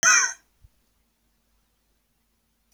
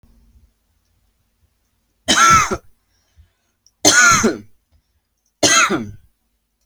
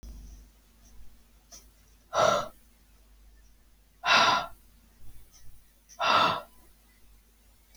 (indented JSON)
{
  "cough_length": "2.7 s",
  "cough_amplitude": 17954,
  "cough_signal_mean_std_ratio": 0.25,
  "three_cough_length": "6.7 s",
  "three_cough_amplitude": 32767,
  "three_cough_signal_mean_std_ratio": 0.37,
  "exhalation_length": "7.8 s",
  "exhalation_amplitude": 11439,
  "exhalation_signal_mean_std_ratio": 0.36,
  "survey_phase": "alpha (2021-03-01 to 2021-08-12)",
  "age": "18-44",
  "gender": "Male",
  "wearing_mask": "No",
  "symptom_none": true,
  "smoker_status": "Ex-smoker",
  "respiratory_condition_asthma": false,
  "respiratory_condition_other": false,
  "recruitment_source": "REACT",
  "submission_delay": "1 day",
  "covid_test_result": "Negative",
  "covid_test_method": "RT-qPCR"
}